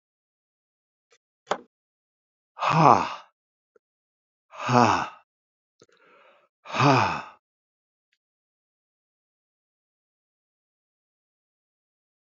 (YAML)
exhalation_length: 12.4 s
exhalation_amplitude: 26914
exhalation_signal_mean_std_ratio: 0.24
survey_phase: alpha (2021-03-01 to 2021-08-12)
age: 65+
gender: Male
wearing_mask: 'No'
symptom_cough_any: true
smoker_status: Never smoked
respiratory_condition_asthma: false
respiratory_condition_other: false
recruitment_source: Test and Trace
submission_delay: 1 day
covid_test_result: Positive
covid_test_method: RT-qPCR
covid_ct_value: 23.2
covid_ct_gene: ORF1ab gene
covid_ct_mean: 24.0
covid_viral_load: 14000 copies/ml
covid_viral_load_category: Low viral load (10K-1M copies/ml)